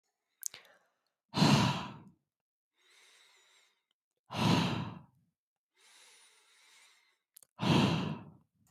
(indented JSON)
{
  "exhalation_length": "8.7 s",
  "exhalation_amplitude": 7160,
  "exhalation_signal_mean_std_ratio": 0.35,
  "survey_phase": "beta (2021-08-13 to 2022-03-07)",
  "age": "18-44",
  "gender": "Male",
  "wearing_mask": "No",
  "symptom_runny_or_blocked_nose": true,
  "smoker_status": "Current smoker (e-cigarettes or vapes only)",
  "respiratory_condition_asthma": false,
  "respiratory_condition_other": false,
  "recruitment_source": "REACT",
  "submission_delay": "1 day",
  "covid_test_result": "Negative",
  "covid_test_method": "RT-qPCR"
}